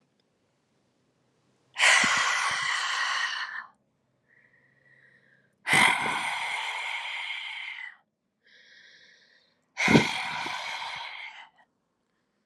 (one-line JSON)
{"exhalation_length": "12.5 s", "exhalation_amplitude": 19216, "exhalation_signal_mean_std_ratio": 0.47, "survey_phase": "alpha (2021-03-01 to 2021-08-12)", "age": "18-44", "gender": "Female", "wearing_mask": "No", "symptom_cough_any": true, "symptom_shortness_of_breath": true, "symptom_fatigue": true, "symptom_change_to_sense_of_smell_or_taste": true, "symptom_loss_of_taste": true, "symptom_onset": "3 days", "smoker_status": "Never smoked", "respiratory_condition_asthma": false, "respiratory_condition_other": false, "recruitment_source": "Test and Trace", "submission_delay": "1 day", "covid_test_result": "Positive", "covid_test_method": "RT-qPCR", "covid_ct_value": 16.0, "covid_ct_gene": "ORF1ab gene", "covid_ct_mean": 16.2, "covid_viral_load": "4700000 copies/ml", "covid_viral_load_category": "High viral load (>1M copies/ml)"}